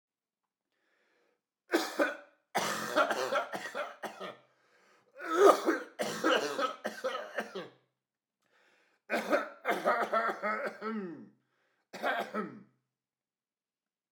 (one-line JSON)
{"three_cough_length": "14.1 s", "three_cough_amplitude": 12377, "three_cough_signal_mean_std_ratio": 0.46, "survey_phase": "beta (2021-08-13 to 2022-03-07)", "age": "18-44", "gender": "Male", "wearing_mask": "Yes", "symptom_cough_any": true, "symptom_runny_or_blocked_nose": true, "symptom_sore_throat": true, "symptom_fatigue": true, "symptom_fever_high_temperature": true, "symptom_headache": true, "symptom_onset": "4 days", "smoker_status": "Never smoked", "respiratory_condition_asthma": false, "respiratory_condition_other": false, "recruitment_source": "Test and Trace", "submission_delay": "1 day", "covid_test_result": "Positive", "covid_test_method": "RT-qPCR", "covid_ct_value": 22.6, "covid_ct_gene": "N gene"}